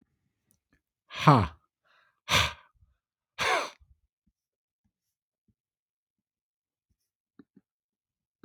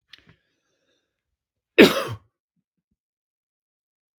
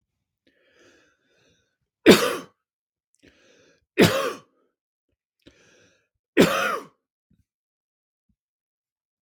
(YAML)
exhalation_length: 8.4 s
exhalation_amplitude: 22470
exhalation_signal_mean_std_ratio: 0.21
cough_length: 4.2 s
cough_amplitude: 32768
cough_signal_mean_std_ratio: 0.16
three_cough_length: 9.2 s
three_cough_amplitude: 32766
three_cough_signal_mean_std_ratio: 0.22
survey_phase: beta (2021-08-13 to 2022-03-07)
age: 45-64
gender: Male
wearing_mask: 'No'
symptom_cough_any: true
symptom_onset: 9 days
smoker_status: Ex-smoker
respiratory_condition_asthma: false
respiratory_condition_other: false
recruitment_source: REACT
submission_delay: 1 day
covid_test_result: Negative
covid_test_method: RT-qPCR
influenza_a_test_result: Negative
influenza_b_test_result: Negative